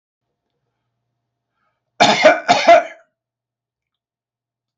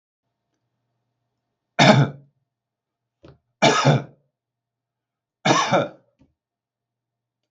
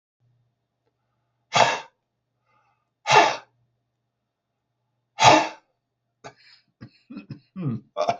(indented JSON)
{
  "cough_length": "4.8 s",
  "cough_amplitude": 32729,
  "cough_signal_mean_std_ratio": 0.3,
  "three_cough_length": "7.5 s",
  "three_cough_amplitude": 32106,
  "three_cough_signal_mean_std_ratio": 0.3,
  "exhalation_length": "8.2 s",
  "exhalation_amplitude": 28426,
  "exhalation_signal_mean_std_ratio": 0.27,
  "survey_phase": "beta (2021-08-13 to 2022-03-07)",
  "age": "65+",
  "gender": "Male",
  "wearing_mask": "No",
  "symptom_none": true,
  "smoker_status": "Ex-smoker",
  "respiratory_condition_asthma": false,
  "respiratory_condition_other": false,
  "recruitment_source": "REACT",
  "submission_delay": "3 days",
  "covid_test_result": "Negative",
  "covid_test_method": "RT-qPCR",
  "influenza_a_test_result": "Negative",
  "influenza_b_test_result": "Negative"
}